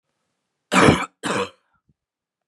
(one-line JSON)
{"cough_length": "2.5 s", "cough_amplitude": 29293, "cough_signal_mean_std_ratio": 0.33, "survey_phase": "beta (2021-08-13 to 2022-03-07)", "age": "18-44", "gender": "Male", "wearing_mask": "No", "symptom_cough_any": true, "symptom_runny_or_blocked_nose": true, "symptom_sore_throat": true, "symptom_onset": "4 days", "smoker_status": "Current smoker (1 to 10 cigarettes per day)", "respiratory_condition_asthma": false, "respiratory_condition_other": false, "recruitment_source": "Test and Trace", "submission_delay": "2 days", "covid_test_result": "Negative", "covid_test_method": "ePCR"}